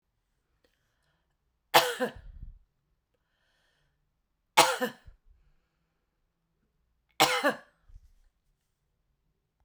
three_cough_length: 9.6 s
three_cough_amplitude: 23743
three_cough_signal_mean_std_ratio: 0.22
survey_phase: beta (2021-08-13 to 2022-03-07)
age: 45-64
gender: Female
wearing_mask: 'No'
symptom_none: true
smoker_status: Never smoked
respiratory_condition_asthma: false
respiratory_condition_other: false
recruitment_source: REACT
submission_delay: 1 day
covid_test_result: Negative
covid_test_method: RT-qPCR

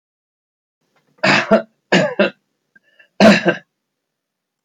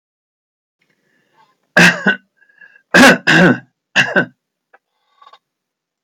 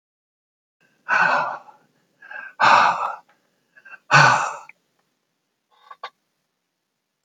three_cough_length: 4.6 s
three_cough_amplitude: 32753
three_cough_signal_mean_std_ratio: 0.35
cough_length: 6.0 s
cough_amplitude: 32768
cough_signal_mean_std_ratio: 0.35
exhalation_length: 7.2 s
exhalation_amplitude: 29769
exhalation_signal_mean_std_ratio: 0.34
survey_phase: beta (2021-08-13 to 2022-03-07)
age: 65+
gender: Male
wearing_mask: 'No'
symptom_none: true
smoker_status: Never smoked
respiratory_condition_asthma: false
respiratory_condition_other: false
recruitment_source: REACT
submission_delay: 2 days
covid_test_result: Negative
covid_test_method: RT-qPCR
influenza_a_test_result: Negative
influenza_b_test_result: Negative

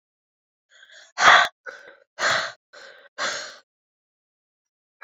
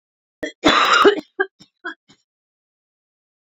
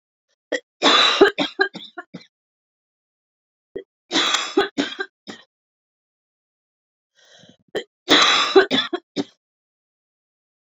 exhalation_length: 5.0 s
exhalation_amplitude: 28232
exhalation_signal_mean_std_ratio: 0.29
cough_length: 3.5 s
cough_amplitude: 28493
cough_signal_mean_std_ratio: 0.34
three_cough_length: 10.8 s
three_cough_amplitude: 29058
three_cough_signal_mean_std_ratio: 0.34
survey_phase: beta (2021-08-13 to 2022-03-07)
age: 18-44
gender: Female
wearing_mask: 'No'
symptom_cough_any: true
symptom_runny_or_blocked_nose: true
symptom_fatigue: true
symptom_headache: true
symptom_change_to_sense_of_smell_or_taste: true
symptom_onset: 3 days
smoker_status: Never smoked
respiratory_condition_asthma: false
respiratory_condition_other: false
recruitment_source: Test and Trace
submission_delay: 2 days
covid_test_result: Positive
covid_test_method: RT-qPCR
covid_ct_value: 16.2
covid_ct_gene: ORF1ab gene
covid_ct_mean: 16.5
covid_viral_load: 3700000 copies/ml
covid_viral_load_category: High viral load (>1M copies/ml)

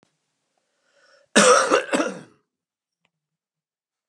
cough_length: 4.1 s
cough_amplitude: 31899
cough_signal_mean_std_ratio: 0.31
survey_phase: beta (2021-08-13 to 2022-03-07)
age: 45-64
gender: Male
wearing_mask: 'No'
symptom_change_to_sense_of_smell_or_taste: true
symptom_loss_of_taste: true
smoker_status: Ex-smoker
respiratory_condition_asthma: false
respiratory_condition_other: false
recruitment_source: REACT
submission_delay: 2 days
covid_test_result: Negative
covid_test_method: RT-qPCR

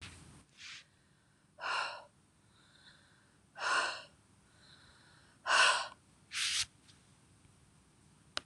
exhalation_length: 8.5 s
exhalation_amplitude: 6750
exhalation_signal_mean_std_ratio: 0.35
survey_phase: beta (2021-08-13 to 2022-03-07)
age: 45-64
gender: Female
wearing_mask: 'No'
symptom_cough_any: true
symptom_onset: 11 days
smoker_status: Never smoked
respiratory_condition_asthma: false
respiratory_condition_other: false
recruitment_source: REACT
submission_delay: 1 day
covid_test_result: Negative
covid_test_method: RT-qPCR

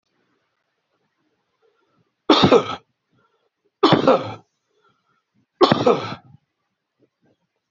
three_cough_length: 7.7 s
three_cough_amplitude: 30787
three_cough_signal_mean_std_ratio: 0.29
survey_phase: beta (2021-08-13 to 2022-03-07)
age: 45-64
gender: Male
wearing_mask: 'No'
symptom_cough_any: true
symptom_runny_or_blocked_nose: true
symptom_sore_throat: true
symptom_fatigue: true
symptom_fever_high_temperature: true
symptom_headache: true
symptom_change_to_sense_of_smell_or_taste: true
smoker_status: Ex-smoker
respiratory_condition_asthma: false
respiratory_condition_other: false
recruitment_source: Test and Trace
submission_delay: 2 days
covid_test_result: Positive
covid_test_method: LFT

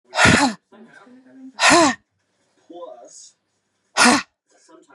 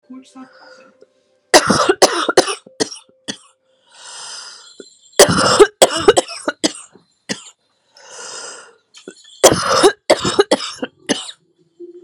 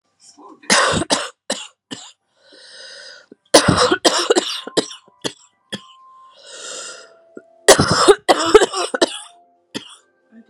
exhalation_length: 4.9 s
exhalation_amplitude: 31007
exhalation_signal_mean_std_ratio: 0.37
three_cough_length: 12.0 s
three_cough_amplitude: 32768
three_cough_signal_mean_std_ratio: 0.37
cough_length: 10.5 s
cough_amplitude: 32768
cough_signal_mean_std_ratio: 0.38
survey_phase: beta (2021-08-13 to 2022-03-07)
age: 18-44
gender: Female
wearing_mask: 'No'
symptom_cough_any: true
symptom_runny_or_blocked_nose: true
symptom_sore_throat: true
symptom_fatigue: true
symptom_onset: 3 days
smoker_status: Never smoked
respiratory_condition_asthma: false
respiratory_condition_other: false
recruitment_source: REACT
submission_delay: 2 days
covid_test_result: Negative
covid_test_method: RT-qPCR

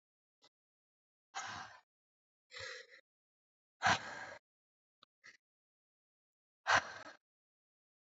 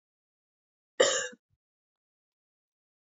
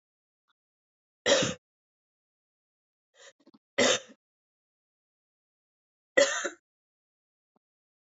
exhalation_length: 8.2 s
exhalation_amplitude: 4105
exhalation_signal_mean_std_ratio: 0.23
cough_length: 3.1 s
cough_amplitude: 11764
cough_signal_mean_std_ratio: 0.21
three_cough_length: 8.2 s
three_cough_amplitude: 14535
three_cough_signal_mean_std_ratio: 0.23
survey_phase: beta (2021-08-13 to 2022-03-07)
age: 45-64
gender: Female
wearing_mask: 'No'
symptom_cough_any: true
symptom_runny_or_blocked_nose: true
symptom_shortness_of_breath: true
symptom_sore_throat: true
symptom_abdominal_pain: true
symptom_fatigue: true
symptom_fever_high_temperature: true
symptom_headache: true
symptom_onset: 3 days
smoker_status: Never smoked
respiratory_condition_asthma: false
respiratory_condition_other: false
recruitment_source: Test and Trace
submission_delay: 2 days
covid_test_result: Positive
covid_test_method: RT-qPCR
covid_ct_value: 17.5
covid_ct_gene: N gene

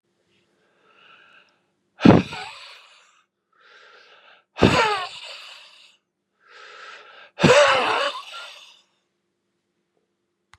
exhalation_length: 10.6 s
exhalation_amplitude: 32768
exhalation_signal_mean_std_ratio: 0.29
survey_phase: beta (2021-08-13 to 2022-03-07)
age: 45-64
gender: Male
wearing_mask: 'No'
symptom_cough_any: true
symptom_runny_or_blocked_nose: true
symptom_diarrhoea: true
symptom_fatigue: true
symptom_onset: 3 days
smoker_status: Current smoker (e-cigarettes or vapes only)
respiratory_condition_asthma: false
respiratory_condition_other: false
recruitment_source: Test and Trace
submission_delay: 2 days
covid_test_result: Positive
covid_test_method: RT-qPCR
covid_ct_value: 19.1
covid_ct_gene: ORF1ab gene
covid_ct_mean: 19.7
covid_viral_load: 360000 copies/ml
covid_viral_load_category: Low viral load (10K-1M copies/ml)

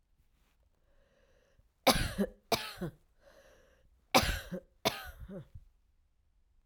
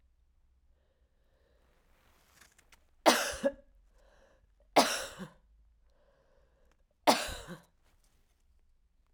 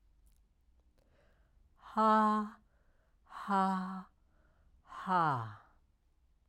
cough_length: 6.7 s
cough_amplitude: 11624
cough_signal_mean_std_ratio: 0.3
three_cough_length: 9.1 s
three_cough_amplitude: 11602
three_cough_signal_mean_std_ratio: 0.24
exhalation_length: 6.5 s
exhalation_amplitude: 3951
exhalation_signal_mean_std_ratio: 0.42
survey_phase: alpha (2021-03-01 to 2021-08-12)
age: 45-64
gender: Female
wearing_mask: 'No'
symptom_cough_any: true
symptom_fatigue: true
symptom_change_to_sense_of_smell_or_taste: true
symptom_onset: 5 days
smoker_status: Never smoked
respiratory_condition_asthma: false
respiratory_condition_other: false
recruitment_source: Test and Trace
submission_delay: 2 days
covid_test_result: Positive
covid_test_method: RT-qPCR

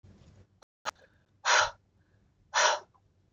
exhalation_length: 3.3 s
exhalation_amplitude: 9282
exhalation_signal_mean_std_ratio: 0.33
survey_phase: beta (2021-08-13 to 2022-03-07)
age: 45-64
gender: Female
wearing_mask: 'Yes'
symptom_none: true
symptom_onset: 6 days
smoker_status: Never smoked
respiratory_condition_asthma: false
respiratory_condition_other: false
recruitment_source: REACT
submission_delay: 21 days
covid_test_result: Negative
covid_test_method: RT-qPCR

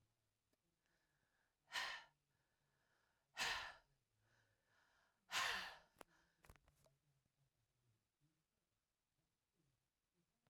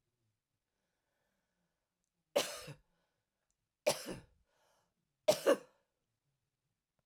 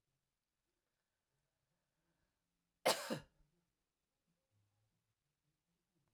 exhalation_length: 10.5 s
exhalation_amplitude: 936
exhalation_signal_mean_std_ratio: 0.26
three_cough_length: 7.1 s
three_cough_amplitude: 4974
three_cough_signal_mean_std_ratio: 0.2
cough_length: 6.1 s
cough_amplitude: 4200
cough_signal_mean_std_ratio: 0.15
survey_phase: beta (2021-08-13 to 2022-03-07)
age: 45-64
gender: Female
wearing_mask: 'No'
symptom_cough_any: true
symptom_new_continuous_cough: true
symptom_runny_or_blocked_nose: true
symptom_sore_throat: true
symptom_abdominal_pain: true
symptom_fatigue: true
symptom_fever_high_temperature: true
symptom_headache: true
symptom_onset: 2 days
smoker_status: Ex-smoker
respiratory_condition_asthma: false
respiratory_condition_other: false
recruitment_source: Test and Trace
submission_delay: 2 days
covid_test_result: Positive
covid_test_method: RT-qPCR
covid_ct_value: 15.3
covid_ct_gene: ORF1ab gene
covid_ct_mean: 15.6
covid_viral_load: 7900000 copies/ml
covid_viral_load_category: High viral load (>1M copies/ml)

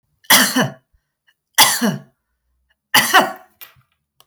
three_cough_length: 4.3 s
three_cough_amplitude: 32768
three_cough_signal_mean_std_ratio: 0.39
survey_phase: beta (2021-08-13 to 2022-03-07)
age: 65+
gender: Female
wearing_mask: 'No'
symptom_none: true
symptom_onset: 11 days
smoker_status: Ex-smoker
respiratory_condition_asthma: false
respiratory_condition_other: false
recruitment_source: REACT
submission_delay: 0 days
covid_test_result: Negative
covid_test_method: RT-qPCR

